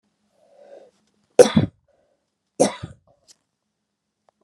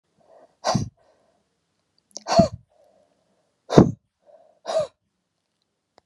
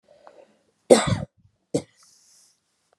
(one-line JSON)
{"three_cough_length": "4.4 s", "three_cough_amplitude": 32768, "three_cough_signal_mean_std_ratio": 0.19, "exhalation_length": "6.1 s", "exhalation_amplitude": 32767, "exhalation_signal_mean_std_ratio": 0.24, "cough_length": "3.0 s", "cough_amplitude": 31552, "cough_signal_mean_std_ratio": 0.22, "survey_phase": "beta (2021-08-13 to 2022-03-07)", "age": "65+", "gender": "Female", "wearing_mask": "No", "symptom_none": true, "smoker_status": "Never smoked", "respiratory_condition_asthma": false, "respiratory_condition_other": false, "recruitment_source": "REACT", "submission_delay": "1 day", "covid_test_result": "Negative", "covid_test_method": "RT-qPCR", "influenza_a_test_result": "Unknown/Void", "influenza_b_test_result": "Unknown/Void"}